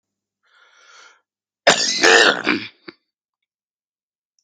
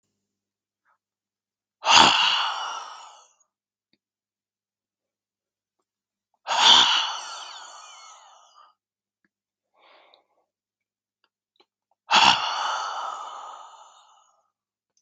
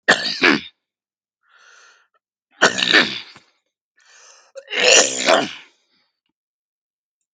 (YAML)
cough_length: 4.4 s
cough_amplitude: 32768
cough_signal_mean_std_ratio: 0.32
exhalation_length: 15.0 s
exhalation_amplitude: 32767
exhalation_signal_mean_std_ratio: 0.31
three_cough_length: 7.3 s
three_cough_amplitude: 32768
three_cough_signal_mean_std_ratio: 0.35
survey_phase: beta (2021-08-13 to 2022-03-07)
age: 45-64
gender: Male
wearing_mask: 'No'
symptom_none: true
smoker_status: Never smoked
respiratory_condition_asthma: true
respiratory_condition_other: false
recruitment_source: REACT
submission_delay: 1 day
covid_test_result: Negative
covid_test_method: RT-qPCR
influenza_a_test_result: Negative
influenza_b_test_result: Negative